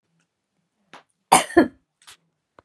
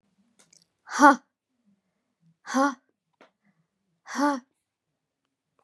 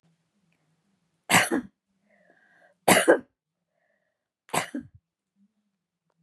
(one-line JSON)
{"cough_length": "2.6 s", "cough_amplitude": 32768, "cough_signal_mean_std_ratio": 0.22, "exhalation_length": "5.6 s", "exhalation_amplitude": 26689, "exhalation_signal_mean_std_ratio": 0.23, "three_cough_length": "6.2 s", "three_cough_amplitude": 26056, "three_cough_signal_mean_std_ratio": 0.25, "survey_phase": "beta (2021-08-13 to 2022-03-07)", "age": "45-64", "gender": "Female", "wearing_mask": "No", "symptom_abdominal_pain": true, "smoker_status": "Never smoked", "respiratory_condition_asthma": false, "respiratory_condition_other": false, "recruitment_source": "REACT", "submission_delay": "1 day", "covid_test_result": "Negative", "covid_test_method": "RT-qPCR", "influenza_a_test_result": "Negative", "influenza_b_test_result": "Negative"}